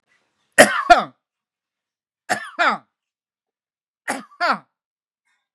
{
  "three_cough_length": "5.5 s",
  "three_cough_amplitude": 32768,
  "three_cough_signal_mean_std_ratio": 0.26,
  "survey_phase": "beta (2021-08-13 to 2022-03-07)",
  "age": "65+",
  "gender": "Male",
  "wearing_mask": "No",
  "symptom_none": true,
  "smoker_status": "Ex-smoker",
  "respiratory_condition_asthma": false,
  "respiratory_condition_other": false,
  "recruitment_source": "REACT",
  "submission_delay": "5 days",
  "covid_test_result": "Negative",
  "covid_test_method": "RT-qPCR"
}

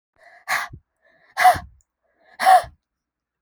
{
  "exhalation_length": "3.4 s",
  "exhalation_amplitude": 25203,
  "exhalation_signal_mean_std_ratio": 0.31,
  "survey_phase": "beta (2021-08-13 to 2022-03-07)",
  "age": "18-44",
  "gender": "Female",
  "wearing_mask": "No",
  "symptom_cough_any": true,
  "symptom_runny_or_blocked_nose": true,
  "symptom_sore_throat": true,
  "symptom_headache": true,
  "smoker_status": "Never smoked",
  "respiratory_condition_asthma": false,
  "respiratory_condition_other": false,
  "recruitment_source": "Test and Trace",
  "submission_delay": "1 day",
  "covid_test_result": "Positive",
  "covid_test_method": "RT-qPCR",
  "covid_ct_value": 20.0,
  "covid_ct_gene": "ORF1ab gene",
  "covid_ct_mean": 20.5,
  "covid_viral_load": "190000 copies/ml",
  "covid_viral_load_category": "Low viral load (10K-1M copies/ml)"
}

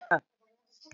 {
  "cough_length": "0.9 s",
  "cough_amplitude": 10050,
  "cough_signal_mean_std_ratio": 0.24,
  "survey_phase": "beta (2021-08-13 to 2022-03-07)",
  "age": "65+",
  "gender": "Female",
  "wearing_mask": "Prefer not to say",
  "symptom_none": true,
  "smoker_status": "Never smoked",
  "respiratory_condition_asthma": false,
  "respiratory_condition_other": false,
  "recruitment_source": "REACT",
  "submission_delay": "2 days",
  "covid_test_result": "Negative",
  "covid_test_method": "RT-qPCR",
  "influenza_a_test_result": "Negative",
  "influenza_b_test_result": "Negative"
}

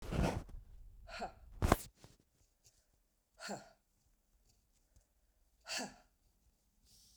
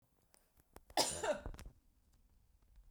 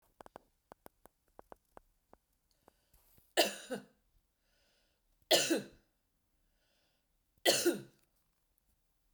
{
  "exhalation_length": "7.2 s",
  "exhalation_amplitude": 12167,
  "exhalation_signal_mean_std_ratio": 0.3,
  "cough_length": "2.9 s",
  "cough_amplitude": 4022,
  "cough_signal_mean_std_ratio": 0.34,
  "three_cough_length": "9.1 s",
  "three_cough_amplitude": 6715,
  "three_cough_signal_mean_std_ratio": 0.24,
  "survey_phase": "beta (2021-08-13 to 2022-03-07)",
  "age": "45-64",
  "gender": "Female",
  "wearing_mask": "No",
  "symptom_none": true,
  "smoker_status": "Never smoked",
  "respiratory_condition_asthma": false,
  "respiratory_condition_other": false,
  "recruitment_source": "REACT",
  "submission_delay": "3 days",
  "covid_test_result": "Negative",
  "covid_test_method": "RT-qPCR"
}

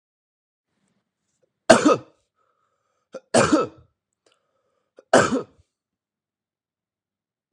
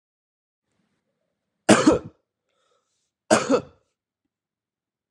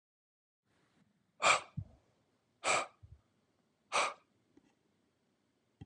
{
  "three_cough_length": "7.5 s",
  "three_cough_amplitude": 32768,
  "three_cough_signal_mean_std_ratio": 0.24,
  "cough_length": "5.1 s",
  "cough_amplitude": 32238,
  "cough_signal_mean_std_ratio": 0.24,
  "exhalation_length": "5.9 s",
  "exhalation_amplitude": 6067,
  "exhalation_signal_mean_std_ratio": 0.26,
  "survey_phase": "alpha (2021-03-01 to 2021-08-12)",
  "age": "18-44",
  "gender": "Male",
  "wearing_mask": "No",
  "symptom_cough_any": true,
  "symptom_headache": true,
  "smoker_status": "Never smoked",
  "respiratory_condition_asthma": true,
  "respiratory_condition_other": false,
  "recruitment_source": "Test and Trace",
  "submission_delay": "1 day",
  "covid_test_result": "Positive",
  "covid_test_method": "RT-qPCR",
  "covid_ct_value": 17.0,
  "covid_ct_gene": "ORF1ab gene",
  "covid_ct_mean": 18.3,
  "covid_viral_load": "970000 copies/ml",
  "covid_viral_load_category": "Low viral load (10K-1M copies/ml)"
}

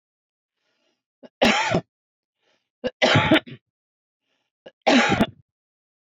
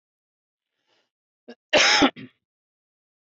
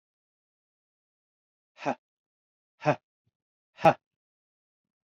{
  "three_cough_length": "6.1 s",
  "three_cough_amplitude": 19878,
  "three_cough_signal_mean_std_ratio": 0.35,
  "cough_length": "3.3 s",
  "cough_amplitude": 16759,
  "cough_signal_mean_std_ratio": 0.27,
  "exhalation_length": "5.1 s",
  "exhalation_amplitude": 14651,
  "exhalation_signal_mean_std_ratio": 0.15,
  "survey_phase": "beta (2021-08-13 to 2022-03-07)",
  "age": "45-64",
  "gender": "Male",
  "wearing_mask": "No",
  "symptom_cough_any": true,
  "symptom_runny_or_blocked_nose": true,
  "symptom_onset": "3 days",
  "smoker_status": "Ex-smoker",
  "respiratory_condition_asthma": true,
  "respiratory_condition_other": false,
  "recruitment_source": "REACT",
  "submission_delay": "1 day",
  "covid_test_result": "Negative",
  "covid_test_method": "RT-qPCR",
  "influenza_a_test_result": "Unknown/Void",
  "influenza_b_test_result": "Unknown/Void"
}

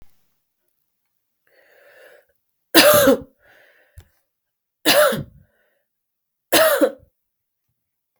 {
  "three_cough_length": "8.2 s",
  "three_cough_amplitude": 32768,
  "three_cough_signal_mean_std_ratio": 0.31,
  "survey_phase": "beta (2021-08-13 to 2022-03-07)",
  "age": "18-44",
  "gender": "Female",
  "wearing_mask": "No",
  "symptom_cough_any": true,
  "symptom_runny_or_blocked_nose": true,
  "symptom_sore_throat": true,
  "symptom_headache": true,
  "symptom_change_to_sense_of_smell_or_taste": true,
  "symptom_onset": "3 days",
  "smoker_status": "Never smoked",
  "respiratory_condition_asthma": false,
  "respiratory_condition_other": false,
  "recruitment_source": "Test and Trace",
  "submission_delay": "1 day",
  "covid_test_result": "Positive",
  "covid_test_method": "RT-qPCR",
  "covid_ct_value": 20.2,
  "covid_ct_gene": "ORF1ab gene",
  "covid_ct_mean": 20.3,
  "covid_viral_load": "220000 copies/ml",
  "covid_viral_load_category": "Low viral load (10K-1M copies/ml)"
}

